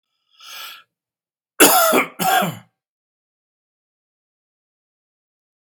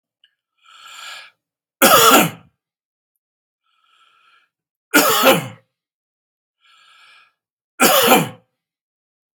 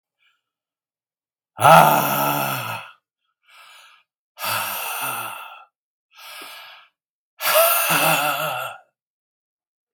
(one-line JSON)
{"cough_length": "5.7 s", "cough_amplitude": 32767, "cough_signal_mean_std_ratio": 0.3, "three_cough_length": "9.4 s", "three_cough_amplitude": 32768, "three_cough_signal_mean_std_ratio": 0.32, "exhalation_length": "9.9 s", "exhalation_amplitude": 32768, "exhalation_signal_mean_std_ratio": 0.41, "survey_phase": "beta (2021-08-13 to 2022-03-07)", "age": "65+", "gender": "Male", "wearing_mask": "No", "symptom_none": true, "smoker_status": "Ex-smoker", "respiratory_condition_asthma": false, "respiratory_condition_other": false, "recruitment_source": "REACT", "submission_delay": "2 days", "covid_test_result": "Negative", "covid_test_method": "RT-qPCR"}